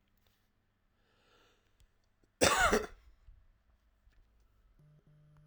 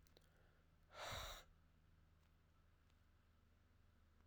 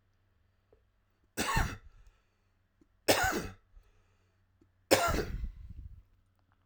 {"cough_length": "5.5 s", "cough_amplitude": 10290, "cough_signal_mean_std_ratio": 0.24, "exhalation_length": "4.3 s", "exhalation_amplitude": 345, "exhalation_signal_mean_std_ratio": 0.48, "three_cough_length": "6.7 s", "three_cough_amplitude": 14514, "three_cough_signal_mean_std_ratio": 0.35, "survey_phase": "alpha (2021-03-01 to 2021-08-12)", "age": "18-44", "gender": "Male", "wearing_mask": "No", "symptom_cough_any": true, "symptom_diarrhoea": true, "symptom_fever_high_temperature": true, "symptom_headache": true, "symptom_onset": "4 days", "smoker_status": "Current smoker (1 to 10 cigarettes per day)", "respiratory_condition_asthma": true, "respiratory_condition_other": false, "recruitment_source": "Test and Trace", "submission_delay": "1 day", "covid_test_result": "Positive", "covid_test_method": "RT-qPCR", "covid_ct_value": 18.5, "covid_ct_gene": "ORF1ab gene"}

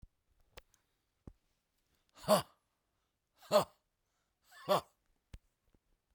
{"exhalation_length": "6.1 s", "exhalation_amplitude": 5319, "exhalation_signal_mean_std_ratio": 0.21, "survey_phase": "beta (2021-08-13 to 2022-03-07)", "age": "45-64", "gender": "Female", "wearing_mask": "No", "symptom_fatigue": true, "smoker_status": "Current smoker (11 or more cigarettes per day)", "respiratory_condition_asthma": false, "respiratory_condition_other": false, "recruitment_source": "REACT", "submission_delay": "1 day", "covid_test_result": "Negative", "covid_test_method": "RT-qPCR"}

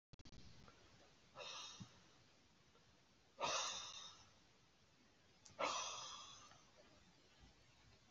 {"exhalation_length": "8.1 s", "exhalation_amplitude": 1143, "exhalation_signal_mean_std_ratio": 0.47, "survey_phase": "beta (2021-08-13 to 2022-03-07)", "age": "65+", "gender": "Male", "wearing_mask": "No", "symptom_runny_or_blocked_nose": true, "symptom_shortness_of_breath": true, "symptom_diarrhoea": true, "smoker_status": "Ex-smoker", "respiratory_condition_asthma": false, "respiratory_condition_other": false, "recruitment_source": "REACT", "submission_delay": "1 day", "covid_test_result": "Negative", "covid_test_method": "RT-qPCR", "influenza_a_test_result": "Negative", "influenza_b_test_result": "Negative"}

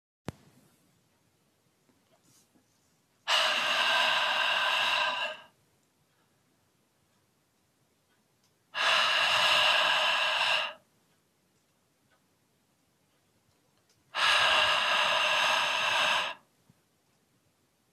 {"exhalation_length": "17.9 s", "exhalation_amplitude": 8591, "exhalation_signal_mean_std_ratio": 0.52, "survey_phase": "beta (2021-08-13 to 2022-03-07)", "age": "65+", "gender": "Male", "wearing_mask": "No", "symptom_none": true, "smoker_status": "Never smoked", "respiratory_condition_asthma": false, "respiratory_condition_other": false, "recruitment_source": "REACT", "submission_delay": "2 days", "covid_test_result": "Negative", "covid_test_method": "RT-qPCR", "influenza_a_test_result": "Unknown/Void", "influenza_b_test_result": "Unknown/Void"}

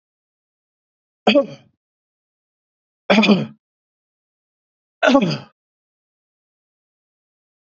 {"three_cough_length": "7.7 s", "three_cough_amplitude": 28075, "three_cough_signal_mean_std_ratio": 0.27, "survey_phase": "beta (2021-08-13 to 2022-03-07)", "age": "65+", "gender": "Male", "wearing_mask": "No", "symptom_none": true, "smoker_status": "Ex-smoker", "respiratory_condition_asthma": false, "respiratory_condition_other": false, "recruitment_source": "REACT", "submission_delay": "1 day", "covid_test_result": "Negative", "covid_test_method": "RT-qPCR", "influenza_a_test_result": "Unknown/Void", "influenza_b_test_result": "Unknown/Void"}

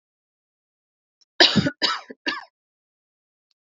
{"three_cough_length": "3.8 s", "three_cough_amplitude": 29243, "three_cough_signal_mean_std_ratio": 0.26, "survey_phase": "alpha (2021-03-01 to 2021-08-12)", "age": "18-44", "gender": "Female", "wearing_mask": "No", "symptom_none": true, "smoker_status": "Never smoked", "respiratory_condition_asthma": false, "respiratory_condition_other": false, "recruitment_source": "REACT", "submission_delay": "1 day", "covid_test_result": "Negative", "covid_test_method": "RT-qPCR"}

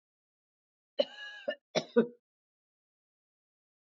{"cough_length": "3.9 s", "cough_amplitude": 7280, "cough_signal_mean_std_ratio": 0.21, "survey_phase": "beta (2021-08-13 to 2022-03-07)", "age": "45-64", "gender": "Female", "wearing_mask": "No", "symptom_none": true, "smoker_status": "Never smoked", "respiratory_condition_asthma": true, "respiratory_condition_other": false, "recruitment_source": "REACT", "submission_delay": "1 day", "covid_test_result": "Negative", "covid_test_method": "RT-qPCR", "influenza_a_test_result": "Negative", "influenza_b_test_result": "Negative"}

